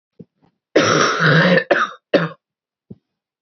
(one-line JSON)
{"cough_length": "3.4 s", "cough_amplitude": 32767, "cough_signal_mean_std_ratio": 0.5, "survey_phase": "beta (2021-08-13 to 2022-03-07)", "age": "18-44", "gender": "Female", "wearing_mask": "No", "symptom_cough_any": true, "symptom_runny_or_blocked_nose": true, "symptom_shortness_of_breath": true, "symptom_fatigue": true, "symptom_headache": true, "symptom_change_to_sense_of_smell_or_taste": true, "symptom_loss_of_taste": true, "symptom_onset": "4 days", "smoker_status": "Never smoked", "respiratory_condition_asthma": false, "respiratory_condition_other": false, "recruitment_source": "Test and Trace", "submission_delay": "2 days", "covid_test_result": "Positive", "covid_test_method": "RT-qPCR", "covid_ct_value": 13.5, "covid_ct_gene": "ORF1ab gene", "covid_ct_mean": 14.0, "covid_viral_load": "25000000 copies/ml", "covid_viral_load_category": "High viral load (>1M copies/ml)"}